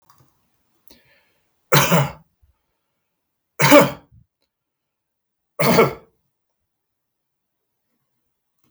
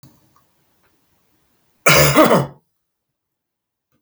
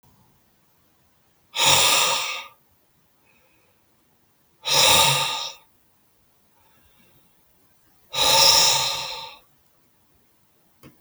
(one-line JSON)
{"three_cough_length": "8.7 s", "three_cough_amplitude": 32768, "three_cough_signal_mean_std_ratio": 0.26, "cough_length": "4.0 s", "cough_amplitude": 32768, "cough_signal_mean_std_ratio": 0.32, "exhalation_length": "11.0 s", "exhalation_amplitude": 27326, "exhalation_signal_mean_std_ratio": 0.39, "survey_phase": "beta (2021-08-13 to 2022-03-07)", "age": "65+", "gender": "Male", "wearing_mask": "No", "symptom_cough_any": true, "symptom_runny_or_blocked_nose": true, "symptom_onset": "13 days", "smoker_status": "Ex-smoker", "respiratory_condition_asthma": false, "respiratory_condition_other": false, "recruitment_source": "REACT", "submission_delay": "1 day", "covid_test_result": "Negative", "covid_test_method": "RT-qPCR"}